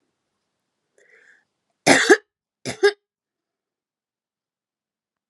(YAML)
cough_length: 5.3 s
cough_amplitude: 32366
cough_signal_mean_std_ratio: 0.21
survey_phase: alpha (2021-03-01 to 2021-08-12)
age: 45-64
gender: Female
wearing_mask: 'No'
symptom_cough_any: true
symptom_fatigue: true
symptom_headache: true
symptom_onset: 3 days
smoker_status: Ex-smoker
respiratory_condition_asthma: false
respiratory_condition_other: false
recruitment_source: Test and Trace
submission_delay: 2 days
covid_test_result: Positive
covid_test_method: RT-qPCR
covid_ct_value: 21.8
covid_ct_gene: ORF1ab gene